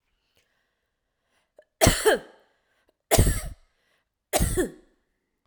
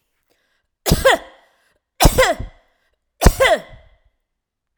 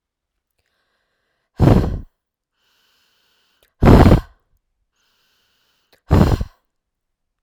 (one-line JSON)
{"cough_length": "5.5 s", "cough_amplitude": 22815, "cough_signal_mean_std_ratio": 0.32, "three_cough_length": "4.8 s", "three_cough_amplitude": 32768, "three_cough_signal_mean_std_ratio": 0.35, "exhalation_length": "7.4 s", "exhalation_amplitude": 32768, "exhalation_signal_mean_std_ratio": 0.28, "survey_phase": "beta (2021-08-13 to 2022-03-07)", "age": "45-64", "gender": "Female", "wearing_mask": "No", "symptom_none": true, "smoker_status": "Never smoked", "respiratory_condition_asthma": false, "respiratory_condition_other": false, "recruitment_source": "REACT", "submission_delay": "1 day", "covid_test_result": "Negative", "covid_test_method": "RT-qPCR"}